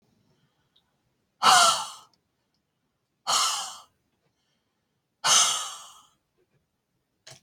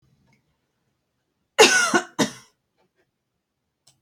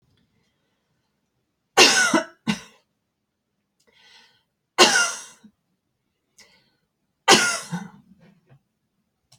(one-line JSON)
{"exhalation_length": "7.4 s", "exhalation_amplitude": 18566, "exhalation_signal_mean_std_ratio": 0.31, "cough_length": "4.0 s", "cough_amplitude": 32767, "cough_signal_mean_std_ratio": 0.26, "three_cough_length": "9.4 s", "three_cough_amplitude": 32130, "three_cough_signal_mean_std_ratio": 0.27, "survey_phase": "beta (2021-08-13 to 2022-03-07)", "age": "18-44", "gender": "Female", "wearing_mask": "No", "symptom_none": true, "smoker_status": "Never smoked", "respiratory_condition_asthma": true, "respiratory_condition_other": false, "recruitment_source": "REACT", "submission_delay": "1 day", "covid_test_result": "Negative", "covid_test_method": "RT-qPCR"}